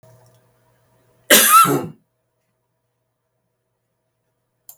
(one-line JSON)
{"cough_length": "4.8 s", "cough_amplitude": 32768, "cough_signal_mean_std_ratio": 0.27, "survey_phase": "beta (2021-08-13 to 2022-03-07)", "age": "65+", "gender": "Female", "wearing_mask": "No", "symptom_none": true, "smoker_status": "Ex-smoker", "respiratory_condition_asthma": false, "respiratory_condition_other": false, "recruitment_source": "REACT", "submission_delay": "2 days", "covid_test_result": "Negative", "covid_test_method": "RT-qPCR", "influenza_a_test_result": "Negative", "influenza_b_test_result": "Negative"}